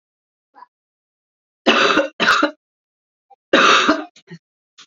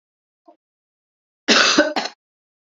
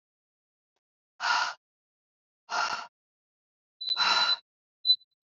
{"three_cough_length": "4.9 s", "three_cough_amplitude": 32768, "three_cough_signal_mean_std_ratio": 0.4, "cough_length": "2.7 s", "cough_amplitude": 28391, "cough_signal_mean_std_ratio": 0.34, "exhalation_length": "5.3 s", "exhalation_amplitude": 7498, "exhalation_signal_mean_std_ratio": 0.38, "survey_phase": "beta (2021-08-13 to 2022-03-07)", "age": "18-44", "gender": "Female", "wearing_mask": "No", "symptom_cough_any": true, "symptom_runny_or_blocked_nose": true, "symptom_headache": true, "symptom_other": true, "symptom_onset": "4 days", "smoker_status": "Never smoked", "respiratory_condition_asthma": false, "respiratory_condition_other": false, "recruitment_source": "Test and Trace", "submission_delay": "1 day", "covid_test_result": "Positive", "covid_test_method": "ePCR"}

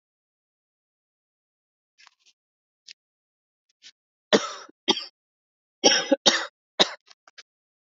{"cough_length": "7.9 s", "cough_amplitude": 32695, "cough_signal_mean_std_ratio": 0.22, "survey_phase": "alpha (2021-03-01 to 2021-08-12)", "age": "18-44", "gender": "Male", "wearing_mask": "No", "symptom_none": true, "smoker_status": "Never smoked", "respiratory_condition_asthma": false, "respiratory_condition_other": false, "recruitment_source": "REACT", "submission_delay": "2 days", "covid_test_result": "Negative", "covid_test_method": "RT-qPCR"}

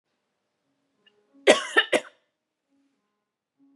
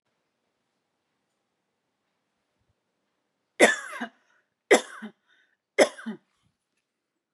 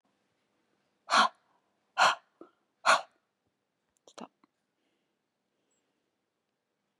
{"cough_length": "3.8 s", "cough_amplitude": 28143, "cough_signal_mean_std_ratio": 0.21, "three_cough_length": "7.3 s", "three_cough_amplitude": 23619, "three_cough_signal_mean_std_ratio": 0.19, "exhalation_length": "7.0 s", "exhalation_amplitude": 10047, "exhalation_signal_mean_std_ratio": 0.21, "survey_phase": "beta (2021-08-13 to 2022-03-07)", "age": "45-64", "gender": "Female", "wearing_mask": "No", "symptom_cough_any": true, "symptom_runny_or_blocked_nose": true, "smoker_status": "Ex-smoker", "respiratory_condition_asthma": false, "respiratory_condition_other": false, "recruitment_source": "REACT", "submission_delay": "1 day", "covid_test_result": "Negative", "covid_test_method": "RT-qPCR", "influenza_a_test_result": "Negative", "influenza_b_test_result": "Negative"}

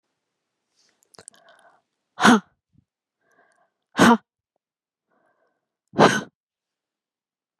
{"exhalation_length": "7.6 s", "exhalation_amplitude": 32649, "exhalation_signal_mean_std_ratio": 0.22, "survey_phase": "beta (2021-08-13 to 2022-03-07)", "age": "45-64", "gender": "Female", "wearing_mask": "No", "symptom_runny_or_blocked_nose": true, "symptom_sore_throat": true, "symptom_abdominal_pain": true, "symptom_fatigue": true, "symptom_headache": true, "symptom_other": true, "symptom_onset": "2 days", "smoker_status": "Never smoked", "respiratory_condition_asthma": false, "respiratory_condition_other": false, "recruitment_source": "Test and Trace", "submission_delay": "1 day", "covid_test_result": "Positive", "covid_test_method": "RT-qPCR", "covid_ct_value": 20.8, "covid_ct_gene": "ORF1ab gene", "covid_ct_mean": 21.1, "covid_viral_load": "120000 copies/ml", "covid_viral_load_category": "Low viral load (10K-1M copies/ml)"}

